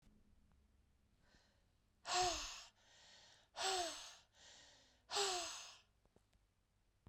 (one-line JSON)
{"exhalation_length": "7.1 s", "exhalation_amplitude": 1624, "exhalation_signal_mean_std_ratio": 0.4, "survey_phase": "beta (2021-08-13 to 2022-03-07)", "age": "45-64", "gender": "Female", "wearing_mask": "No", "symptom_cough_any": true, "symptom_runny_or_blocked_nose": true, "symptom_sore_throat": true, "symptom_headache": true, "symptom_change_to_sense_of_smell_or_taste": true, "symptom_onset": "4 days", "smoker_status": "Never smoked", "respiratory_condition_asthma": false, "respiratory_condition_other": false, "recruitment_source": "Test and Trace", "submission_delay": "1 day", "covid_test_result": "Positive", "covid_test_method": "RT-qPCR", "covid_ct_value": 20.7, "covid_ct_gene": "ORF1ab gene", "covid_ct_mean": 21.3, "covid_viral_load": "100000 copies/ml", "covid_viral_load_category": "Low viral load (10K-1M copies/ml)"}